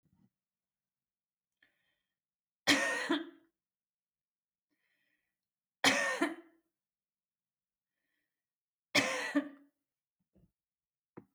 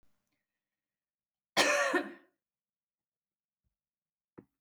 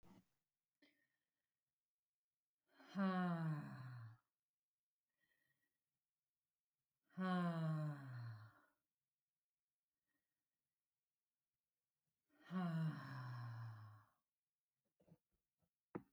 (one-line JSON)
{"three_cough_length": "11.3 s", "three_cough_amplitude": 7628, "three_cough_signal_mean_std_ratio": 0.27, "cough_length": "4.6 s", "cough_amplitude": 8078, "cough_signal_mean_std_ratio": 0.26, "exhalation_length": "16.1 s", "exhalation_amplitude": 739, "exhalation_signal_mean_std_ratio": 0.4, "survey_phase": "beta (2021-08-13 to 2022-03-07)", "age": "45-64", "gender": "Female", "wearing_mask": "No", "symptom_none": true, "smoker_status": "Never smoked", "respiratory_condition_asthma": false, "respiratory_condition_other": false, "recruitment_source": "REACT", "submission_delay": "0 days", "covid_test_result": "Negative", "covid_test_method": "RT-qPCR"}